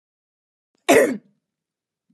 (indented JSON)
{
  "cough_length": "2.1 s",
  "cough_amplitude": 27045,
  "cough_signal_mean_std_ratio": 0.27,
  "survey_phase": "alpha (2021-03-01 to 2021-08-12)",
  "age": "18-44",
  "gender": "Female",
  "wearing_mask": "No",
  "symptom_none": true,
  "smoker_status": "Never smoked",
  "respiratory_condition_asthma": false,
  "respiratory_condition_other": false,
  "recruitment_source": "REACT",
  "submission_delay": "4 days",
  "covid_test_result": "Negative",
  "covid_test_method": "RT-qPCR"
}